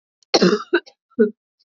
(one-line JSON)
{"cough_length": "1.8 s", "cough_amplitude": 27802, "cough_signal_mean_std_ratio": 0.38, "survey_phase": "beta (2021-08-13 to 2022-03-07)", "age": "18-44", "gender": "Female", "wearing_mask": "No", "symptom_cough_any": true, "symptom_runny_or_blocked_nose": true, "symptom_fatigue": true, "symptom_headache": true, "symptom_change_to_sense_of_smell_or_taste": true, "symptom_onset": "4 days", "smoker_status": "Never smoked", "respiratory_condition_asthma": false, "respiratory_condition_other": false, "recruitment_source": "Test and Trace", "submission_delay": "4 days", "covid_test_result": "Positive", "covid_test_method": "RT-qPCR"}